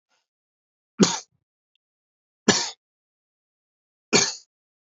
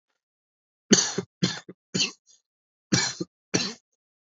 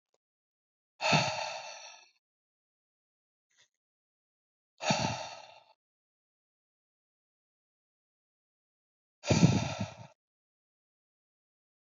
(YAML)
three_cough_length: 4.9 s
three_cough_amplitude: 26742
three_cough_signal_mean_std_ratio: 0.24
cough_length: 4.4 s
cough_amplitude: 25365
cough_signal_mean_std_ratio: 0.33
exhalation_length: 11.9 s
exhalation_amplitude: 11984
exhalation_signal_mean_std_ratio: 0.26
survey_phase: alpha (2021-03-01 to 2021-08-12)
age: 18-44
gender: Male
wearing_mask: 'No'
symptom_cough_any: true
symptom_fatigue: true
symptom_headache: true
symptom_change_to_sense_of_smell_or_taste: true
symptom_loss_of_taste: true
symptom_onset: 3 days
smoker_status: Ex-smoker
respiratory_condition_asthma: false
respiratory_condition_other: false
recruitment_source: Test and Trace
submission_delay: 1 day
covid_test_result: Positive
covid_test_method: RT-qPCR